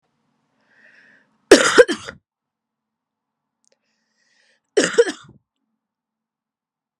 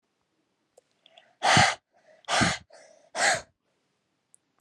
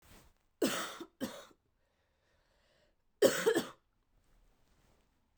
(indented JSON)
{
  "cough_length": "7.0 s",
  "cough_amplitude": 32768,
  "cough_signal_mean_std_ratio": 0.21,
  "exhalation_length": "4.6 s",
  "exhalation_amplitude": 16304,
  "exhalation_signal_mean_std_ratio": 0.34,
  "three_cough_length": "5.4 s",
  "three_cough_amplitude": 7935,
  "three_cough_signal_mean_std_ratio": 0.29,
  "survey_phase": "beta (2021-08-13 to 2022-03-07)",
  "age": "18-44",
  "gender": "Female",
  "wearing_mask": "No",
  "symptom_cough_any": true,
  "symptom_new_continuous_cough": true,
  "symptom_runny_or_blocked_nose": true,
  "symptom_fatigue": true,
  "symptom_headache": true,
  "symptom_change_to_sense_of_smell_or_taste": true,
  "symptom_loss_of_taste": true,
  "symptom_other": true,
  "symptom_onset": "8 days",
  "smoker_status": "Never smoked",
  "respiratory_condition_asthma": true,
  "respiratory_condition_other": false,
  "recruitment_source": "Test and Trace",
  "submission_delay": "0 days",
  "covid_test_result": "Positive",
  "covid_test_method": "RT-qPCR",
  "covid_ct_value": 19.3,
  "covid_ct_gene": "ORF1ab gene",
  "covid_ct_mean": 20.3,
  "covid_viral_load": "220000 copies/ml",
  "covid_viral_load_category": "Low viral load (10K-1M copies/ml)"
}